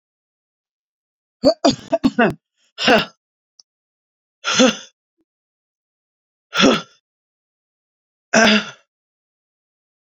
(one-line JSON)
{"exhalation_length": "10.1 s", "exhalation_amplitude": 32768, "exhalation_signal_mean_std_ratio": 0.3, "survey_phase": "beta (2021-08-13 to 2022-03-07)", "age": "45-64", "gender": "Female", "wearing_mask": "No", "symptom_cough_any": true, "symptom_sore_throat": true, "symptom_diarrhoea": true, "symptom_fatigue": true, "symptom_fever_high_temperature": true, "symptom_headache": true, "symptom_change_to_sense_of_smell_or_taste": true, "symptom_loss_of_taste": true, "symptom_onset": "4 days", "smoker_status": "Never smoked", "respiratory_condition_asthma": false, "respiratory_condition_other": false, "recruitment_source": "Test and Trace", "submission_delay": "1 day", "covid_test_result": "Positive", "covid_test_method": "RT-qPCR", "covid_ct_value": 22.3, "covid_ct_gene": "ORF1ab gene"}